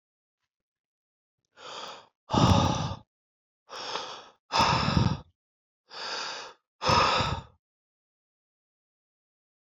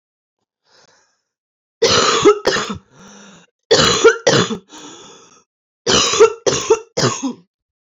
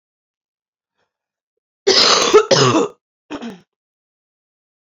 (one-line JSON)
{"exhalation_length": "9.7 s", "exhalation_amplitude": 13413, "exhalation_signal_mean_std_ratio": 0.39, "three_cough_length": "7.9 s", "three_cough_amplitude": 31394, "three_cough_signal_mean_std_ratio": 0.46, "cough_length": "4.9 s", "cough_amplitude": 32768, "cough_signal_mean_std_ratio": 0.37, "survey_phase": "beta (2021-08-13 to 2022-03-07)", "age": "18-44", "gender": "Female", "wearing_mask": "No", "symptom_new_continuous_cough": true, "symptom_runny_or_blocked_nose": true, "symptom_sore_throat": true, "symptom_fatigue": true, "symptom_headache": true, "symptom_onset": "3 days", "smoker_status": "Ex-smoker", "respiratory_condition_asthma": true, "respiratory_condition_other": false, "recruitment_source": "Test and Trace", "submission_delay": "1 day", "covid_test_result": "Positive", "covid_test_method": "RT-qPCR"}